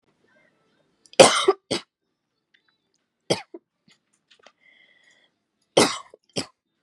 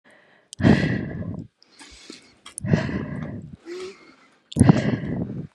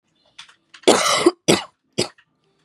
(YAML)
three_cough_length: 6.8 s
three_cough_amplitude: 32768
three_cough_signal_mean_std_ratio: 0.2
exhalation_length: 5.5 s
exhalation_amplitude: 31430
exhalation_signal_mean_std_ratio: 0.44
cough_length: 2.6 s
cough_amplitude: 32767
cough_signal_mean_std_ratio: 0.36
survey_phase: beta (2021-08-13 to 2022-03-07)
age: 18-44
gender: Female
wearing_mask: 'No'
symptom_cough_any: true
symptom_runny_or_blocked_nose: true
symptom_sore_throat: true
symptom_fatigue: true
symptom_fever_high_temperature: true
symptom_headache: true
symptom_onset: 3 days
smoker_status: Current smoker (e-cigarettes or vapes only)
respiratory_condition_asthma: false
respiratory_condition_other: false
recruitment_source: Test and Trace
submission_delay: 1 day
covid_test_result: Positive
covid_test_method: RT-qPCR
covid_ct_value: 19.4
covid_ct_gene: ORF1ab gene